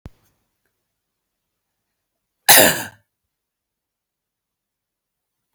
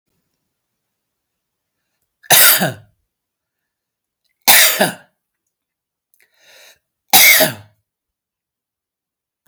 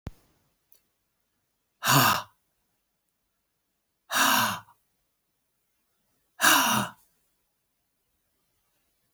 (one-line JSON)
{"cough_length": "5.5 s", "cough_amplitude": 32768, "cough_signal_mean_std_ratio": 0.18, "three_cough_length": "9.5 s", "three_cough_amplitude": 32768, "three_cough_signal_mean_std_ratio": 0.28, "exhalation_length": "9.1 s", "exhalation_amplitude": 16053, "exhalation_signal_mean_std_ratio": 0.3, "survey_phase": "beta (2021-08-13 to 2022-03-07)", "age": "45-64", "gender": "Male", "wearing_mask": "No", "symptom_none": true, "smoker_status": "Never smoked", "respiratory_condition_asthma": false, "respiratory_condition_other": false, "recruitment_source": "REACT", "submission_delay": "2 days", "covid_test_result": "Negative", "covid_test_method": "RT-qPCR", "influenza_a_test_result": "Negative", "influenza_b_test_result": "Negative"}